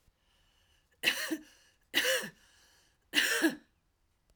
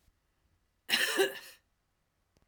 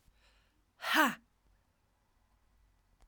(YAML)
three_cough_length: 4.4 s
three_cough_amplitude: 7873
three_cough_signal_mean_std_ratio: 0.39
cough_length: 2.5 s
cough_amplitude: 6205
cough_signal_mean_std_ratio: 0.34
exhalation_length: 3.1 s
exhalation_amplitude: 6266
exhalation_signal_mean_std_ratio: 0.25
survey_phase: beta (2021-08-13 to 2022-03-07)
age: 45-64
gender: Female
wearing_mask: 'No'
symptom_cough_any: true
symptom_runny_or_blocked_nose: true
symptom_sore_throat: true
symptom_abdominal_pain: true
symptom_diarrhoea: true
symptom_headache: true
symptom_onset: 3 days
smoker_status: Current smoker (1 to 10 cigarettes per day)
respiratory_condition_asthma: true
respiratory_condition_other: false
recruitment_source: Test and Trace
submission_delay: 2 days
covid_test_result: Positive
covid_test_method: RT-qPCR
covid_ct_value: 24.3
covid_ct_gene: N gene